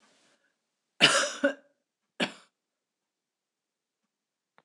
{"cough_length": "4.6 s", "cough_amplitude": 18397, "cough_signal_mean_std_ratio": 0.24, "survey_phase": "beta (2021-08-13 to 2022-03-07)", "age": "65+", "gender": "Female", "wearing_mask": "No", "symptom_abdominal_pain": true, "symptom_diarrhoea": true, "symptom_fatigue": true, "smoker_status": "Ex-smoker", "respiratory_condition_asthma": false, "respiratory_condition_other": false, "recruitment_source": "REACT", "submission_delay": "2 days", "covid_test_result": "Negative", "covid_test_method": "RT-qPCR", "influenza_a_test_result": "Negative", "influenza_b_test_result": "Negative"}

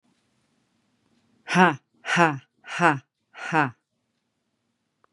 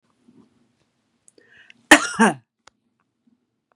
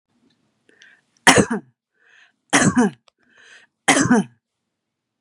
{"exhalation_length": "5.1 s", "exhalation_amplitude": 29475, "exhalation_signal_mean_std_ratio": 0.29, "cough_length": "3.8 s", "cough_amplitude": 32768, "cough_signal_mean_std_ratio": 0.2, "three_cough_length": "5.2 s", "three_cough_amplitude": 32768, "three_cough_signal_mean_std_ratio": 0.34, "survey_phase": "beta (2021-08-13 to 2022-03-07)", "age": "45-64", "gender": "Female", "wearing_mask": "No", "symptom_none": true, "symptom_onset": "8 days", "smoker_status": "Never smoked", "respiratory_condition_asthma": false, "respiratory_condition_other": false, "recruitment_source": "REACT", "submission_delay": "1 day", "covid_test_result": "Negative", "covid_test_method": "RT-qPCR"}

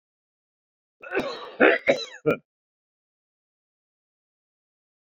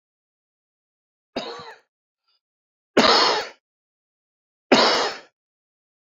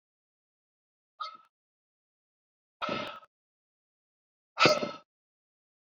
{"cough_length": "5.0 s", "cough_amplitude": 26205, "cough_signal_mean_std_ratio": 0.26, "three_cough_length": "6.1 s", "three_cough_amplitude": 27227, "three_cough_signal_mean_std_ratio": 0.31, "exhalation_length": "5.9 s", "exhalation_amplitude": 17127, "exhalation_signal_mean_std_ratio": 0.22, "survey_phase": "beta (2021-08-13 to 2022-03-07)", "age": "65+", "gender": "Male", "wearing_mask": "No", "symptom_cough_any": true, "symptom_new_continuous_cough": true, "symptom_shortness_of_breath": true, "symptom_sore_throat": true, "symptom_fatigue": true, "smoker_status": "Ex-smoker", "respiratory_condition_asthma": false, "respiratory_condition_other": false, "recruitment_source": "Test and Trace", "submission_delay": "2 days", "covid_test_result": "Positive", "covid_test_method": "RT-qPCR", "covid_ct_value": 37.3, "covid_ct_gene": "N gene"}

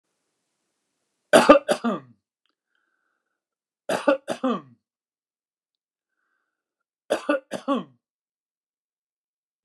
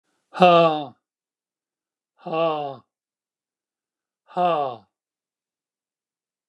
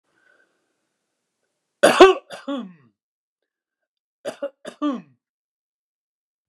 {"three_cough_length": "9.6 s", "three_cough_amplitude": 29204, "three_cough_signal_mean_std_ratio": 0.23, "exhalation_length": "6.5 s", "exhalation_amplitude": 27988, "exhalation_signal_mean_std_ratio": 0.32, "cough_length": "6.5 s", "cough_amplitude": 29204, "cough_signal_mean_std_ratio": 0.21, "survey_phase": "beta (2021-08-13 to 2022-03-07)", "age": "65+", "gender": "Male", "wearing_mask": "No", "symptom_none": true, "smoker_status": "Ex-smoker", "respiratory_condition_asthma": false, "respiratory_condition_other": false, "recruitment_source": "REACT", "submission_delay": "3 days", "covid_test_result": "Negative", "covid_test_method": "RT-qPCR"}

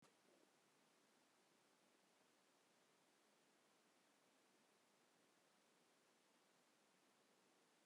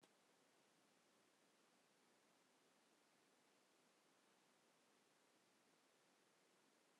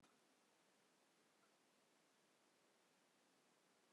{"exhalation_length": "7.9 s", "exhalation_amplitude": 30, "exhalation_signal_mean_std_ratio": 1.1, "three_cough_length": "7.0 s", "three_cough_amplitude": 60, "three_cough_signal_mean_std_ratio": 1.1, "cough_length": "3.9 s", "cough_amplitude": 28, "cough_signal_mean_std_ratio": 1.11, "survey_phase": "alpha (2021-03-01 to 2021-08-12)", "age": "65+", "gender": "Female", "wearing_mask": "No", "symptom_none": true, "smoker_status": "Ex-smoker", "respiratory_condition_asthma": false, "respiratory_condition_other": false, "recruitment_source": "REACT", "submission_delay": "1 day", "covid_test_result": "Negative", "covid_test_method": "RT-qPCR"}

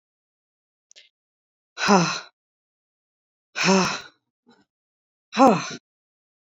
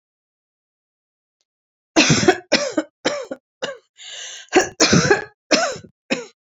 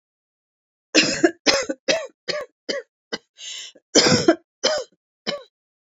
{"exhalation_length": "6.5 s", "exhalation_amplitude": 26362, "exhalation_signal_mean_std_ratio": 0.29, "three_cough_length": "6.5 s", "three_cough_amplitude": 31676, "three_cough_signal_mean_std_ratio": 0.41, "cough_length": "5.8 s", "cough_amplitude": 29818, "cough_signal_mean_std_ratio": 0.4, "survey_phase": "beta (2021-08-13 to 2022-03-07)", "age": "45-64", "gender": "Female", "wearing_mask": "No", "symptom_cough_any": true, "symptom_new_continuous_cough": true, "symptom_runny_or_blocked_nose": true, "symptom_sore_throat": true, "symptom_headache": true, "symptom_other": true, "symptom_onset": "3 days", "smoker_status": "Current smoker (e-cigarettes or vapes only)", "respiratory_condition_asthma": false, "respiratory_condition_other": false, "recruitment_source": "Test and Trace", "submission_delay": "1 day", "covid_test_result": "Positive", "covid_test_method": "RT-qPCR", "covid_ct_value": 19.4, "covid_ct_gene": "N gene"}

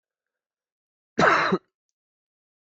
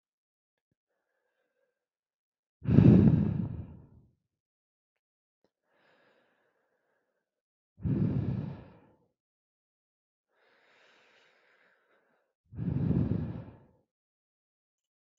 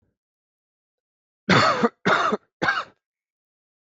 {"cough_length": "2.7 s", "cough_amplitude": 17436, "cough_signal_mean_std_ratio": 0.29, "exhalation_length": "15.2 s", "exhalation_amplitude": 16712, "exhalation_signal_mean_std_ratio": 0.27, "three_cough_length": "3.8 s", "three_cough_amplitude": 18050, "three_cough_signal_mean_std_ratio": 0.38, "survey_phase": "beta (2021-08-13 to 2022-03-07)", "age": "18-44", "gender": "Male", "wearing_mask": "No", "symptom_cough_any": true, "symptom_runny_or_blocked_nose": true, "smoker_status": "Never smoked", "respiratory_condition_asthma": false, "respiratory_condition_other": false, "recruitment_source": "Test and Trace", "submission_delay": "1 day", "covid_test_result": "Positive", "covid_test_method": "ePCR"}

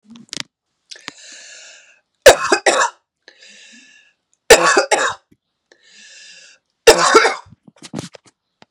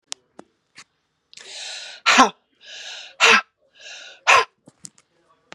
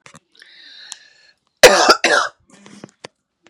{"three_cough_length": "8.7 s", "three_cough_amplitude": 32768, "three_cough_signal_mean_std_ratio": 0.32, "exhalation_length": "5.5 s", "exhalation_amplitude": 32767, "exhalation_signal_mean_std_ratio": 0.3, "cough_length": "3.5 s", "cough_amplitude": 32768, "cough_signal_mean_std_ratio": 0.3, "survey_phase": "beta (2021-08-13 to 2022-03-07)", "age": "45-64", "gender": "Female", "wearing_mask": "No", "symptom_cough_any": true, "symptom_runny_or_blocked_nose": true, "symptom_sore_throat": true, "symptom_fatigue": true, "symptom_headache": true, "symptom_other": true, "symptom_onset": "6 days", "smoker_status": "Ex-smoker", "respiratory_condition_asthma": false, "respiratory_condition_other": false, "recruitment_source": "Test and Trace", "submission_delay": "1 day", "covid_test_result": "Positive", "covid_test_method": "RT-qPCR", "covid_ct_value": 13.9, "covid_ct_gene": "ORF1ab gene"}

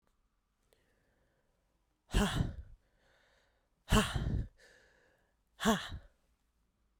{"exhalation_length": "7.0 s", "exhalation_amplitude": 5704, "exhalation_signal_mean_std_ratio": 0.32, "survey_phase": "beta (2021-08-13 to 2022-03-07)", "age": "18-44", "gender": "Female", "wearing_mask": "No", "symptom_cough_any": true, "symptom_runny_or_blocked_nose": true, "symptom_headache": true, "symptom_change_to_sense_of_smell_or_taste": true, "symptom_onset": "4 days", "smoker_status": "Never smoked", "respiratory_condition_asthma": false, "respiratory_condition_other": false, "recruitment_source": "Test and Trace", "submission_delay": "2 days", "covid_test_result": "Positive", "covid_test_method": "RT-qPCR", "covid_ct_value": 20.3, "covid_ct_gene": "N gene", "covid_ct_mean": 21.1, "covid_viral_load": "120000 copies/ml", "covid_viral_load_category": "Low viral load (10K-1M copies/ml)"}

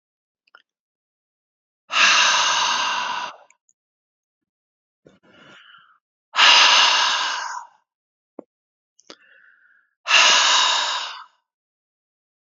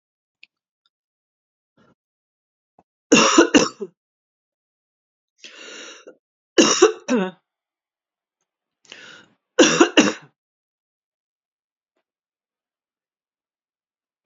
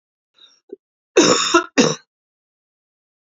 {"exhalation_length": "12.5 s", "exhalation_amplitude": 31067, "exhalation_signal_mean_std_ratio": 0.42, "three_cough_length": "14.3 s", "three_cough_amplitude": 30715, "three_cough_signal_mean_std_ratio": 0.24, "cough_length": "3.2 s", "cough_amplitude": 32439, "cough_signal_mean_std_ratio": 0.34, "survey_phase": "beta (2021-08-13 to 2022-03-07)", "age": "45-64", "gender": "Female", "wearing_mask": "No", "symptom_cough_any": true, "symptom_new_continuous_cough": true, "symptom_runny_or_blocked_nose": true, "symptom_sore_throat": true, "symptom_fatigue": true, "symptom_fever_high_temperature": true, "symptom_headache": true, "symptom_change_to_sense_of_smell_or_taste": true, "symptom_loss_of_taste": true, "symptom_onset": "5 days", "smoker_status": "Never smoked", "respiratory_condition_asthma": false, "respiratory_condition_other": false, "recruitment_source": "Test and Trace", "submission_delay": "2 days", "covid_test_result": "Positive", "covid_test_method": "RT-qPCR"}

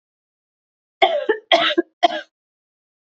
{"three_cough_length": "3.2 s", "three_cough_amplitude": 29897, "three_cough_signal_mean_std_ratio": 0.35, "survey_phase": "beta (2021-08-13 to 2022-03-07)", "age": "18-44", "gender": "Female", "wearing_mask": "No", "symptom_runny_or_blocked_nose": true, "symptom_fatigue": true, "symptom_change_to_sense_of_smell_or_taste": true, "symptom_onset": "6 days", "smoker_status": "Never smoked", "respiratory_condition_asthma": false, "respiratory_condition_other": false, "recruitment_source": "Test and Trace", "submission_delay": "2 days", "covid_test_result": "Positive", "covid_test_method": "RT-qPCR", "covid_ct_value": 23.6, "covid_ct_gene": "N gene"}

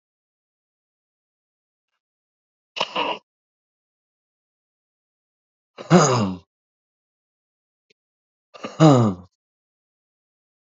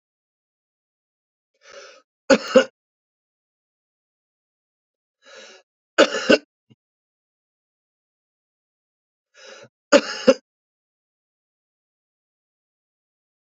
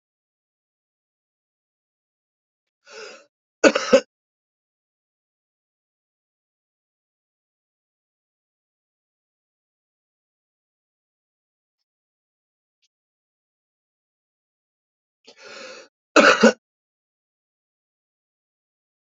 {"exhalation_length": "10.7 s", "exhalation_amplitude": 30085, "exhalation_signal_mean_std_ratio": 0.23, "three_cough_length": "13.5 s", "three_cough_amplitude": 29495, "three_cough_signal_mean_std_ratio": 0.17, "cough_length": "19.2 s", "cough_amplitude": 28740, "cough_signal_mean_std_ratio": 0.13, "survey_phase": "beta (2021-08-13 to 2022-03-07)", "age": "45-64", "gender": "Male", "wearing_mask": "No", "symptom_cough_any": true, "symptom_runny_or_blocked_nose": true, "symptom_sore_throat": true, "symptom_diarrhoea": true, "symptom_fatigue": true, "symptom_headache": true, "smoker_status": "Current smoker (11 or more cigarettes per day)", "respiratory_condition_asthma": false, "respiratory_condition_other": false, "recruitment_source": "Test and Trace", "submission_delay": "2 days", "covid_test_result": "Positive", "covid_test_method": "RT-qPCR", "covid_ct_value": 16.4, "covid_ct_gene": "ORF1ab gene"}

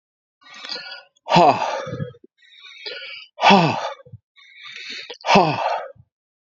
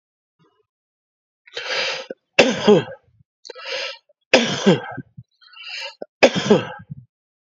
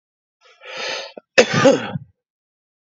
{"exhalation_length": "6.5 s", "exhalation_amplitude": 29515, "exhalation_signal_mean_std_ratio": 0.42, "three_cough_length": "7.5 s", "three_cough_amplitude": 32767, "three_cough_signal_mean_std_ratio": 0.36, "cough_length": "3.0 s", "cough_amplitude": 29017, "cough_signal_mean_std_ratio": 0.34, "survey_phase": "beta (2021-08-13 to 2022-03-07)", "age": "45-64", "gender": "Male", "wearing_mask": "No", "symptom_cough_any": true, "symptom_new_continuous_cough": true, "symptom_runny_or_blocked_nose": true, "symptom_sore_throat": true, "symptom_fatigue": true, "symptom_fever_high_temperature": true, "symptom_change_to_sense_of_smell_or_taste": true, "symptom_loss_of_taste": true, "smoker_status": "Never smoked", "respiratory_condition_asthma": false, "respiratory_condition_other": false, "recruitment_source": "Test and Trace", "submission_delay": "1 day", "covid_test_result": "Positive", "covid_test_method": "LFT"}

